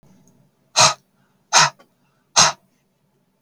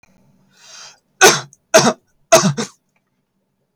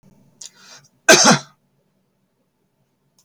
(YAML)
exhalation_length: 3.4 s
exhalation_amplitude: 32768
exhalation_signal_mean_std_ratio: 0.29
three_cough_length: 3.8 s
three_cough_amplitude: 32768
three_cough_signal_mean_std_ratio: 0.32
cough_length: 3.2 s
cough_amplitude: 32768
cough_signal_mean_std_ratio: 0.25
survey_phase: beta (2021-08-13 to 2022-03-07)
age: 45-64
gender: Male
wearing_mask: 'No'
symptom_none: true
smoker_status: Never smoked
respiratory_condition_asthma: false
respiratory_condition_other: false
recruitment_source: REACT
submission_delay: 2 days
covid_test_result: Negative
covid_test_method: RT-qPCR
influenza_a_test_result: Negative
influenza_b_test_result: Negative